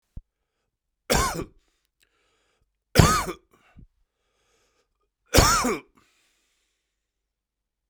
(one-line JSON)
{"three_cough_length": "7.9 s", "three_cough_amplitude": 32768, "three_cough_signal_mean_std_ratio": 0.27, "survey_phase": "beta (2021-08-13 to 2022-03-07)", "age": "45-64", "gender": "Male", "wearing_mask": "No", "symptom_cough_any": true, "symptom_new_continuous_cough": true, "symptom_sore_throat": true, "symptom_fatigue": true, "symptom_fever_high_temperature": true, "symptom_headache": true, "symptom_onset": "3 days", "smoker_status": "Never smoked", "respiratory_condition_asthma": false, "respiratory_condition_other": false, "recruitment_source": "Test and Trace", "submission_delay": "2 days", "covid_test_result": "Positive", "covid_test_method": "RT-qPCR", "covid_ct_value": 14.5, "covid_ct_gene": "S gene", "covid_ct_mean": 14.6, "covid_viral_load": "16000000 copies/ml", "covid_viral_load_category": "High viral load (>1M copies/ml)"}